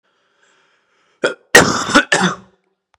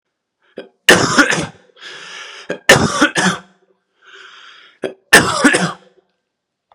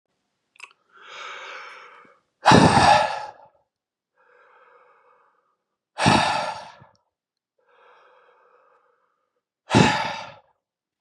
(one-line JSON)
{"cough_length": "3.0 s", "cough_amplitude": 32768, "cough_signal_mean_std_ratio": 0.36, "three_cough_length": "6.7 s", "three_cough_amplitude": 32768, "three_cough_signal_mean_std_ratio": 0.4, "exhalation_length": "11.0 s", "exhalation_amplitude": 30082, "exhalation_signal_mean_std_ratio": 0.31, "survey_phase": "beta (2021-08-13 to 2022-03-07)", "age": "18-44", "gender": "Male", "wearing_mask": "No", "symptom_runny_or_blocked_nose": true, "symptom_onset": "12 days", "smoker_status": "Never smoked", "respiratory_condition_asthma": false, "respiratory_condition_other": false, "recruitment_source": "REACT", "submission_delay": "0 days", "covid_test_result": "Negative", "covid_test_method": "RT-qPCR"}